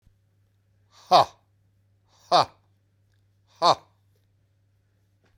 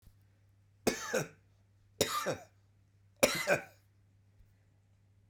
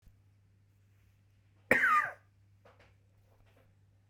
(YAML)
exhalation_length: 5.4 s
exhalation_amplitude: 25430
exhalation_signal_mean_std_ratio: 0.21
three_cough_length: 5.3 s
three_cough_amplitude: 11401
three_cough_signal_mean_std_ratio: 0.33
cough_length: 4.1 s
cough_amplitude: 9638
cough_signal_mean_std_ratio: 0.27
survey_phase: beta (2021-08-13 to 2022-03-07)
age: 45-64
gender: Male
wearing_mask: 'No'
symptom_none: true
smoker_status: Never smoked
respiratory_condition_asthma: false
respiratory_condition_other: false
recruitment_source: Test and Trace
submission_delay: 0 days
covid_test_result: Negative
covid_test_method: LFT